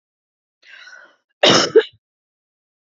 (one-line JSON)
{"cough_length": "2.9 s", "cough_amplitude": 31656, "cough_signal_mean_std_ratio": 0.27, "survey_phase": "beta (2021-08-13 to 2022-03-07)", "age": "45-64", "gender": "Female", "wearing_mask": "No", "symptom_cough_any": true, "symptom_onset": "12 days", "smoker_status": "Never smoked", "respiratory_condition_asthma": false, "respiratory_condition_other": false, "recruitment_source": "REACT", "submission_delay": "3 days", "covid_test_result": "Negative", "covid_test_method": "RT-qPCR", "influenza_a_test_result": "Negative", "influenza_b_test_result": "Negative"}